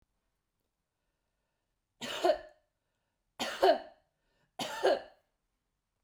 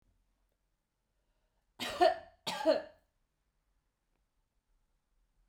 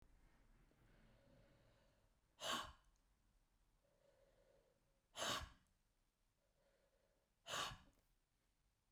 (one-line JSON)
{"three_cough_length": "6.0 s", "three_cough_amplitude": 7859, "three_cough_signal_mean_std_ratio": 0.29, "cough_length": "5.5 s", "cough_amplitude": 6319, "cough_signal_mean_std_ratio": 0.24, "exhalation_length": "8.9 s", "exhalation_amplitude": 854, "exhalation_signal_mean_std_ratio": 0.31, "survey_phase": "beta (2021-08-13 to 2022-03-07)", "age": "65+", "gender": "Female", "wearing_mask": "No", "symptom_none": true, "smoker_status": "Never smoked", "respiratory_condition_asthma": false, "respiratory_condition_other": false, "recruitment_source": "REACT", "submission_delay": "1 day", "covid_test_result": "Negative", "covid_test_method": "RT-qPCR"}